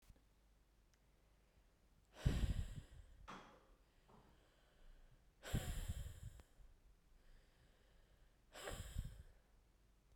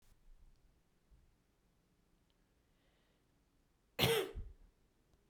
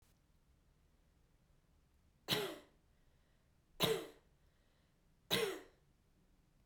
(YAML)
exhalation_length: 10.2 s
exhalation_amplitude: 2249
exhalation_signal_mean_std_ratio: 0.38
cough_length: 5.3 s
cough_amplitude: 4009
cough_signal_mean_std_ratio: 0.25
three_cough_length: 6.7 s
three_cough_amplitude: 3413
three_cough_signal_mean_std_ratio: 0.3
survey_phase: beta (2021-08-13 to 2022-03-07)
age: 18-44
gender: Female
wearing_mask: 'No'
symptom_runny_or_blocked_nose: true
symptom_fatigue: true
symptom_headache: true
symptom_change_to_sense_of_smell_or_taste: true
symptom_loss_of_taste: true
symptom_onset: 6 days
smoker_status: Ex-smoker
respiratory_condition_asthma: true
respiratory_condition_other: false
recruitment_source: REACT
submission_delay: 3 days
covid_test_result: Positive
covid_test_method: RT-qPCR
covid_ct_value: 18.0
covid_ct_gene: E gene